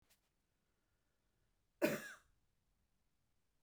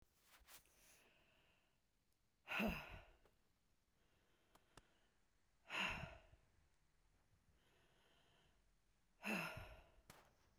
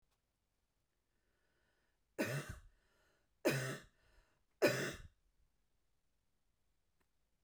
cough_length: 3.6 s
cough_amplitude: 2873
cough_signal_mean_std_ratio: 0.2
exhalation_length: 10.6 s
exhalation_amplitude: 1019
exhalation_signal_mean_std_ratio: 0.33
three_cough_length: 7.4 s
three_cough_amplitude: 3616
three_cough_signal_mean_std_ratio: 0.27
survey_phase: beta (2021-08-13 to 2022-03-07)
age: 45-64
gender: Female
wearing_mask: 'No'
symptom_fatigue: true
symptom_change_to_sense_of_smell_or_taste: true
symptom_loss_of_taste: true
smoker_status: Ex-smoker
respiratory_condition_asthma: false
respiratory_condition_other: false
recruitment_source: Test and Trace
submission_delay: 3 days
covid_test_result: Positive
covid_test_method: LAMP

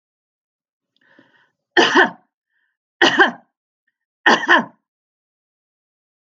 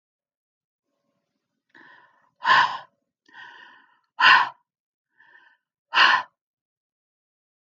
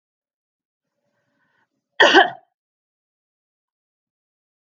three_cough_length: 6.4 s
three_cough_amplitude: 32767
three_cough_signal_mean_std_ratio: 0.29
exhalation_length: 7.8 s
exhalation_amplitude: 27888
exhalation_signal_mean_std_ratio: 0.26
cough_length: 4.7 s
cough_amplitude: 28965
cough_signal_mean_std_ratio: 0.19
survey_phase: alpha (2021-03-01 to 2021-08-12)
age: 65+
gender: Female
wearing_mask: 'No'
symptom_none: true
smoker_status: Ex-smoker
respiratory_condition_asthma: false
respiratory_condition_other: false
recruitment_source: REACT
submission_delay: 1 day
covid_test_result: Negative
covid_test_method: RT-qPCR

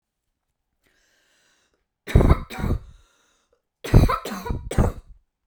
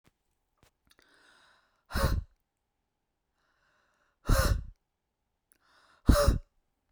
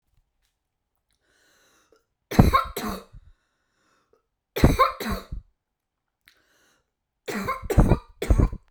cough_length: 5.5 s
cough_amplitude: 29723
cough_signal_mean_std_ratio: 0.33
exhalation_length: 6.9 s
exhalation_amplitude: 16629
exhalation_signal_mean_std_ratio: 0.28
three_cough_length: 8.7 s
three_cough_amplitude: 32767
three_cough_signal_mean_std_ratio: 0.32
survey_phase: beta (2021-08-13 to 2022-03-07)
age: 18-44
gender: Female
wearing_mask: 'No'
symptom_cough_any: true
symptom_fatigue: true
symptom_onset: 11 days
smoker_status: Never smoked
respiratory_condition_asthma: false
respiratory_condition_other: false
recruitment_source: REACT
submission_delay: 0 days
covid_test_result: Negative
covid_test_method: RT-qPCR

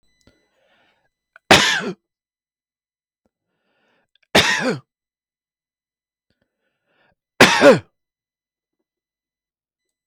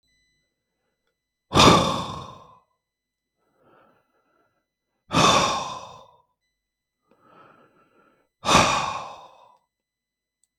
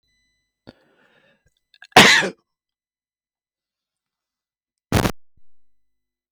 three_cough_length: 10.1 s
three_cough_amplitude: 32768
three_cough_signal_mean_std_ratio: 0.24
exhalation_length: 10.6 s
exhalation_amplitude: 31190
exhalation_signal_mean_std_ratio: 0.3
cough_length: 6.3 s
cough_amplitude: 32766
cough_signal_mean_std_ratio: 0.21
survey_phase: beta (2021-08-13 to 2022-03-07)
age: 65+
gender: Male
wearing_mask: 'No'
symptom_none: true
smoker_status: Ex-smoker
respiratory_condition_asthma: false
respiratory_condition_other: false
recruitment_source: REACT
submission_delay: 4 days
covid_test_result: Negative
covid_test_method: RT-qPCR
influenza_a_test_result: Negative
influenza_b_test_result: Negative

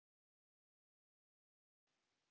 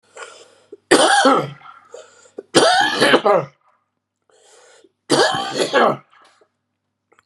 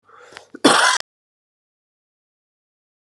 exhalation_length: 2.3 s
exhalation_amplitude: 5
exhalation_signal_mean_std_ratio: 0.3
three_cough_length: 7.3 s
three_cough_amplitude: 32768
three_cough_signal_mean_std_ratio: 0.46
cough_length: 3.1 s
cough_amplitude: 32089
cough_signal_mean_std_ratio: 0.27
survey_phase: beta (2021-08-13 to 2022-03-07)
age: 65+
gender: Male
wearing_mask: 'No'
symptom_cough_any: true
symptom_runny_or_blocked_nose: true
symptom_fatigue: true
symptom_change_to_sense_of_smell_or_taste: true
symptom_loss_of_taste: true
symptom_onset: 3 days
smoker_status: Ex-smoker
respiratory_condition_asthma: false
respiratory_condition_other: false
recruitment_source: Test and Trace
submission_delay: 2 days
covid_test_result: Positive
covid_test_method: RT-qPCR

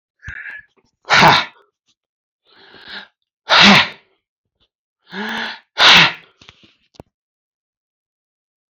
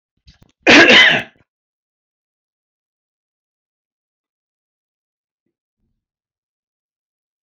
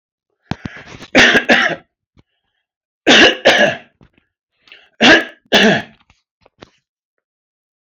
exhalation_length: 8.7 s
exhalation_amplitude: 32122
exhalation_signal_mean_std_ratio: 0.32
cough_length: 7.4 s
cough_amplitude: 32714
cough_signal_mean_std_ratio: 0.23
three_cough_length: 7.9 s
three_cough_amplitude: 32767
three_cough_signal_mean_std_ratio: 0.38
survey_phase: beta (2021-08-13 to 2022-03-07)
age: 65+
gender: Male
wearing_mask: 'No'
symptom_none: true
smoker_status: Never smoked
respiratory_condition_asthma: false
respiratory_condition_other: false
recruitment_source: REACT
submission_delay: 1 day
covid_test_result: Negative
covid_test_method: RT-qPCR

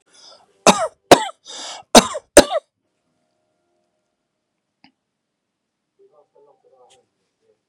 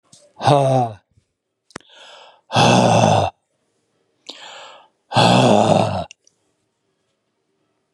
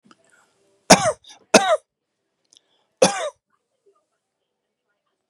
cough_length: 7.7 s
cough_amplitude: 32768
cough_signal_mean_std_ratio: 0.19
exhalation_length: 7.9 s
exhalation_amplitude: 32734
exhalation_signal_mean_std_ratio: 0.44
three_cough_length: 5.3 s
three_cough_amplitude: 32768
three_cough_signal_mean_std_ratio: 0.23
survey_phase: beta (2021-08-13 to 2022-03-07)
age: 45-64
gender: Male
wearing_mask: 'No'
symptom_none: true
smoker_status: Never smoked
respiratory_condition_asthma: false
respiratory_condition_other: false
recruitment_source: REACT
submission_delay: 6 days
covid_test_result: Negative
covid_test_method: RT-qPCR
influenza_a_test_result: Negative
influenza_b_test_result: Negative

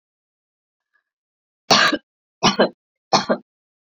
three_cough_length: 3.8 s
three_cough_amplitude: 32544
three_cough_signal_mean_std_ratio: 0.31
survey_phase: beta (2021-08-13 to 2022-03-07)
age: 18-44
gender: Female
wearing_mask: 'No'
symptom_cough_any: true
symptom_runny_or_blocked_nose: true
symptom_sore_throat: true
symptom_headache: true
symptom_change_to_sense_of_smell_or_taste: true
smoker_status: Never smoked
respiratory_condition_asthma: false
respiratory_condition_other: false
recruitment_source: Test and Trace
submission_delay: 2 days
covid_test_result: Positive
covid_test_method: RT-qPCR
covid_ct_value: 19.1
covid_ct_gene: ORF1ab gene
covid_ct_mean: 20.2
covid_viral_load: 230000 copies/ml
covid_viral_load_category: Low viral load (10K-1M copies/ml)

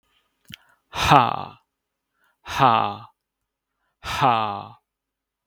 exhalation_length: 5.5 s
exhalation_amplitude: 32768
exhalation_signal_mean_std_ratio: 0.35
survey_phase: beta (2021-08-13 to 2022-03-07)
age: 45-64
gender: Male
wearing_mask: 'No'
symptom_none: true
smoker_status: Never smoked
respiratory_condition_asthma: false
respiratory_condition_other: false
recruitment_source: REACT
submission_delay: 1 day
covid_test_result: Negative
covid_test_method: RT-qPCR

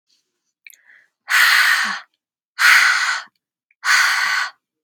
exhalation_length: 4.8 s
exhalation_amplitude: 31638
exhalation_signal_mean_std_ratio: 0.53
survey_phase: beta (2021-08-13 to 2022-03-07)
age: 18-44
gender: Female
wearing_mask: 'No'
symptom_none: true
smoker_status: Never smoked
respiratory_condition_asthma: false
respiratory_condition_other: false
recruitment_source: REACT
submission_delay: 3 days
covid_test_result: Negative
covid_test_method: RT-qPCR
influenza_a_test_result: Negative
influenza_b_test_result: Negative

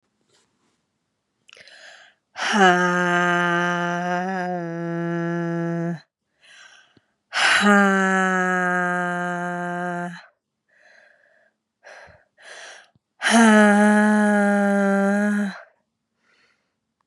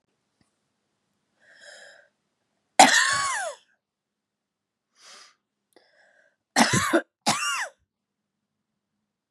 exhalation_length: 17.1 s
exhalation_amplitude: 30093
exhalation_signal_mean_std_ratio: 0.57
cough_length: 9.3 s
cough_amplitude: 32591
cough_signal_mean_std_ratio: 0.28
survey_phase: beta (2021-08-13 to 2022-03-07)
age: 45-64
gender: Female
wearing_mask: 'No'
symptom_cough_any: true
symptom_runny_or_blocked_nose: true
symptom_sore_throat: true
symptom_fatigue: true
symptom_fever_high_temperature: true
symptom_headache: true
symptom_change_to_sense_of_smell_or_taste: true
symptom_loss_of_taste: true
symptom_onset: 3 days
smoker_status: Current smoker (e-cigarettes or vapes only)
respiratory_condition_asthma: false
respiratory_condition_other: false
recruitment_source: Test and Trace
submission_delay: 2 days
covid_test_result: Positive
covid_test_method: RT-qPCR
covid_ct_value: 20.0
covid_ct_gene: ORF1ab gene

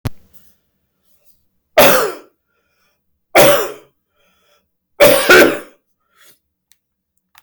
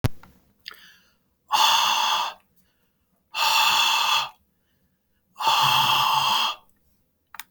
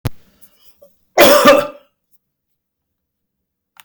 three_cough_length: 7.4 s
three_cough_amplitude: 32768
three_cough_signal_mean_std_ratio: 0.34
exhalation_length: 7.5 s
exhalation_amplitude: 19812
exhalation_signal_mean_std_ratio: 0.57
cough_length: 3.8 s
cough_amplitude: 32768
cough_signal_mean_std_ratio: 0.31
survey_phase: beta (2021-08-13 to 2022-03-07)
age: 45-64
gender: Male
wearing_mask: 'No'
symptom_diarrhoea: true
smoker_status: Never smoked
respiratory_condition_asthma: false
respiratory_condition_other: false
recruitment_source: REACT
submission_delay: 1 day
covid_test_result: Negative
covid_test_method: RT-qPCR
influenza_a_test_result: Negative
influenza_b_test_result: Negative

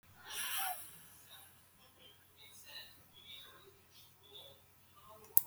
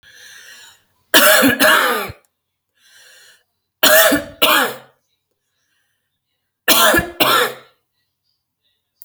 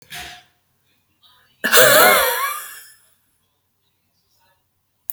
exhalation_length: 5.5 s
exhalation_amplitude: 24611
exhalation_signal_mean_std_ratio: 0.28
three_cough_length: 9.0 s
three_cough_amplitude: 32768
three_cough_signal_mean_std_ratio: 0.42
cough_length: 5.1 s
cough_amplitude: 32768
cough_signal_mean_std_ratio: 0.34
survey_phase: beta (2021-08-13 to 2022-03-07)
age: 65+
gender: Female
wearing_mask: 'No'
symptom_none: true
smoker_status: Never smoked
respiratory_condition_asthma: false
respiratory_condition_other: false
recruitment_source: REACT
submission_delay: 2 days
covid_test_result: Negative
covid_test_method: RT-qPCR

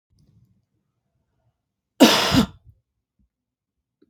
cough_length: 4.1 s
cough_amplitude: 32766
cough_signal_mean_std_ratio: 0.24
survey_phase: beta (2021-08-13 to 2022-03-07)
age: 45-64
gender: Female
wearing_mask: 'No'
symptom_none: true
smoker_status: Ex-smoker
respiratory_condition_asthma: false
respiratory_condition_other: false
recruitment_source: REACT
submission_delay: 6 days
covid_test_result: Negative
covid_test_method: RT-qPCR
influenza_a_test_result: Negative
influenza_b_test_result: Negative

